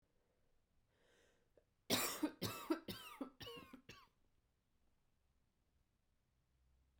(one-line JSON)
{"three_cough_length": "7.0 s", "three_cough_amplitude": 2560, "three_cough_signal_mean_std_ratio": 0.31, "survey_phase": "beta (2021-08-13 to 2022-03-07)", "age": "18-44", "gender": "Female", "wearing_mask": "No", "symptom_cough_any": true, "symptom_runny_or_blocked_nose": true, "symptom_shortness_of_breath": true, "symptom_sore_throat": true, "symptom_abdominal_pain": true, "symptom_fatigue": true, "symptom_fever_high_temperature": true, "symptom_headache": true, "symptom_change_to_sense_of_smell_or_taste": true, "symptom_onset": "6 days", "smoker_status": "Never smoked", "respiratory_condition_asthma": false, "respiratory_condition_other": false, "recruitment_source": "Test and Trace", "submission_delay": "2 days", "covid_test_result": "Positive", "covid_test_method": "RT-qPCR", "covid_ct_value": 19.3, "covid_ct_gene": "ORF1ab gene", "covid_ct_mean": 19.9, "covid_viral_load": "290000 copies/ml", "covid_viral_load_category": "Low viral load (10K-1M copies/ml)"}